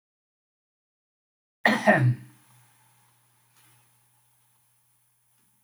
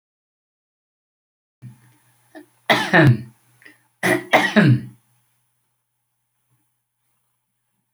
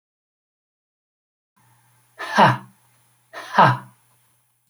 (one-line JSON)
{"cough_length": "5.6 s", "cough_amplitude": 18406, "cough_signal_mean_std_ratio": 0.24, "three_cough_length": "7.9 s", "three_cough_amplitude": 28924, "three_cough_signal_mean_std_ratio": 0.29, "exhalation_length": "4.7 s", "exhalation_amplitude": 28223, "exhalation_signal_mean_std_ratio": 0.26, "survey_phase": "beta (2021-08-13 to 2022-03-07)", "age": "65+", "gender": "Male", "wearing_mask": "No", "symptom_none": true, "smoker_status": "Never smoked", "respiratory_condition_asthma": false, "respiratory_condition_other": false, "recruitment_source": "REACT", "submission_delay": "2 days", "covid_test_result": "Negative", "covid_test_method": "RT-qPCR"}